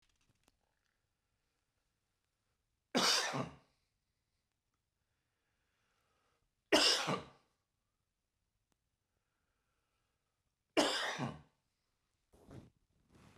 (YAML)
three_cough_length: 13.4 s
three_cough_amplitude: 5809
three_cough_signal_mean_std_ratio: 0.26
survey_phase: beta (2021-08-13 to 2022-03-07)
age: 45-64
gender: Male
wearing_mask: 'No'
symptom_fatigue: true
symptom_headache: true
smoker_status: Ex-smoker
respiratory_condition_asthma: false
respiratory_condition_other: false
recruitment_source: REACT
submission_delay: 1 day
covid_test_result: Positive
covid_test_method: RT-qPCR
covid_ct_value: 29.0
covid_ct_gene: E gene